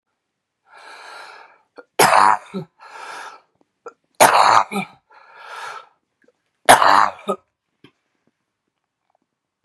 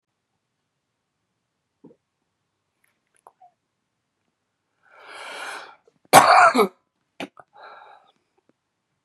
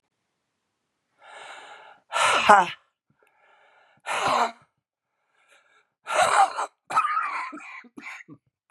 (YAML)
three_cough_length: 9.6 s
three_cough_amplitude: 32768
three_cough_signal_mean_std_ratio: 0.3
cough_length: 9.0 s
cough_amplitude: 32768
cough_signal_mean_std_ratio: 0.2
exhalation_length: 8.7 s
exhalation_amplitude: 32202
exhalation_signal_mean_std_ratio: 0.37
survey_phase: beta (2021-08-13 to 2022-03-07)
age: 65+
gender: Female
wearing_mask: 'No'
symptom_cough_any: true
symptom_fatigue: true
symptom_headache: true
symptom_change_to_sense_of_smell_or_taste: true
symptom_onset: 4 days
smoker_status: Ex-smoker
respiratory_condition_asthma: true
respiratory_condition_other: false
recruitment_source: Test and Trace
submission_delay: 2 days
covid_test_result: Positive
covid_test_method: RT-qPCR